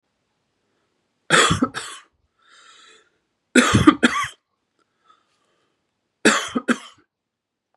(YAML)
cough_length: 7.8 s
cough_amplitude: 32768
cough_signal_mean_std_ratio: 0.3
survey_phase: beta (2021-08-13 to 2022-03-07)
age: 45-64
gender: Male
wearing_mask: 'No'
symptom_cough_any: true
symptom_runny_or_blocked_nose: true
symptom_fatigue: true
symptom_fever_high_temperature: true
symptom_loss_of_taste: true
symptom_onset: 2 days
smoker_status: Ex-smoker
respiratory_condition_asthma: false
respiratory_condition_other: false
recruitment_source: Test and Trace
submission_delay: 1 day
covid_test_result: Positive
covid_test_method: ePCR